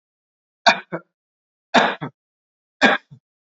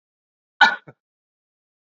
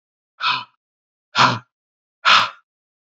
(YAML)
three_cough_length: 3.5 s
three_cough_amplitude: 31618
three_cough_signal_mean_std_ratio: 0.28
cough_length: 1.9 s
cough_amplitude: 28305
cough_signal_mean_std_ratio: 0.19
exhalation_length: 3.1 s
exhalation_amplitude: 30064
exhalation_signal_mean_std_ratio: 0.34
survey_phase: beta (2021-08-13 to 2022-03-07)
age: 18-44
gender: Male
wearing_mask: 'No'
symptom_none: true
smoker_status: Never smoked
respiratory_condition_asthma: false
respiratory_condition_other: false
recruitment_source: REACT
submission_delay: 2 days
covid_test_result: Negative
covid_test_method: RT-qPCR